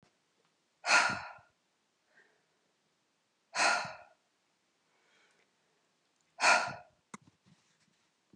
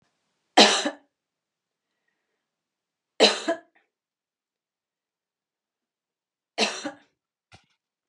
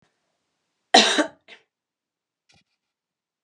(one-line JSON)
{"exhalation_length": "8.4 s", "exhalation_amplitude": 8769, "exhalation_signal_mean_std_ratio": 0.27, "three_cough_length": "8.1 s", "three_cough_amplitude": 29589, "three_cough_signal_mean_std_ratio": 0.21, "cough_length": "3.4 s", "cough_amplitude": 30881, "cough_signal_mean_std_ratio": 0.21, "survey_phase": "beta (2021-08-13 to 2022-03-07)", "age": "45-64", "gender": "Female", "wearing_mask": "No", "symptom_cough_any": true, "symptom_runny_or_blocked_nose": true, "symptom_sore_throat": true, "symptom_fatigue": true, "symptom_change_to_sense_of_smell_or_taste": true, "symptom_onset": "8 days", "smoker_status": "Never smoked", "respiratory_condition_asthma": false, "respiratory_condition_other": false, "recruitment_source": "REACT", "submission_delay": "0 days", "covid_test_result": "Positive", "covid_test_method": "RT-qPCR", "covid_ct_value": 26.4, "covid_ct_gene": "E gene", "influenza_a_test_result": "Negative", "influenza_b_test_result": "Negative"}